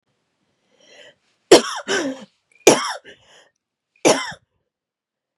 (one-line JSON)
{"three_cough_length": "5.4 s", "three_cough_amplitude": 32768, "three_cough_signal_mean_std_ratio": 0.27, "survey_phase": "beta (2021-08-13 to 2022-03-07)", "age": "45-64", "gender": "Female", "wearing_mask": "No", "symptom_cough_any": true, "symptom_runny_or_blocked_nose": true, "symptom_shortness_of_breath": true, "symptom_sore_throat": true, "symptom_abdominal_pain": true, "symptom_fatigue": true, "symptom_headache": true, "symptom_change_to_sense_of_smell_or_taste": true, "symptom_onset": "4 days", "smoker_status": "Never smoked", "respiratory_condition_asthma": true, "respiratory_condition_other": false, "recruitment_source": "Test and Trace", "submission_delay": "2 days", "covid_test_result": "Positive", "covid_test_method": "RT-qPCR", "covid_ct_value": 16.1, "covid_ct_gene": "N gene", "covid_ct_mean": 16.1, "covid_viral_load": "5300000 copies/ml", "covid_viral_load_category": "High viral load (>1M copies/ml)"}